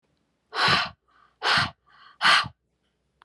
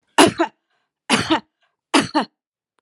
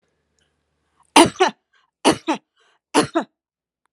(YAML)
exhalation_length: 3.2 s
exhalation_amplitude: 19539
exhalation_signal_mean_std_ratio: 0.41
cough_length: 2.8 s
cough_amplitude: 32767
cough_signal_mean_std_ratio: 0.36
three_cough_length: 3.9 s
three_cough_amplitude: 32768
three_cough_signal_mean_std_ratio: 0.28
survey_phase: alpha (2021-03-01 to 2021-08-12)
age: 45-64
gender: Female
wearing_mask: 'No'
symptom_none: true
smoker_status: Never smoked
respiratory_condition_asthma: false
respiratory_condition_other: false
recruitment_source: REACT
submission_delay: 1 day
covid_test_result: Negative
covid_test_method: RT-qPCR